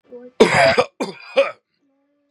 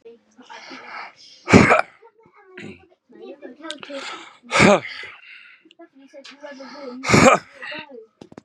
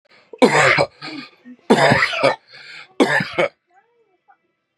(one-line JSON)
{"cough_length": "2.3 s", "cough_amplitude": 32768, "cough_signal_mean_std_ratio": 0.43, "exhalation_length": "8.4 s", "exhalation_amplitude": 32768, "exhalation_signal_mean_std_ratio": 0.33, "three_cough_length": "4.8 s", "three_cough_amplitude": 32755, "three_cough_signal_mean_std_ratio": 0.46, "survey_phase": "beta (2021-08-13 to 2022-03-07)", "age": "18-44", "gender": "Male", "wearing_mask": "No", "symptom_cough_any": true, "symptom_sore_throat": true, "symptom_diarrhoea": true, "symptom_change_to_sense_of_smell_or_taste": true, "symptom_onset": "2 days", "smoker_status": "Never smoked", "respiratory_condition_asthma": false, "respiratory_condition_other": false, "recruitment_source": "Test and Trace", "submission_delay": "1 day", "covid_test_result": "Positive", "covid_test_method": "ePCR"}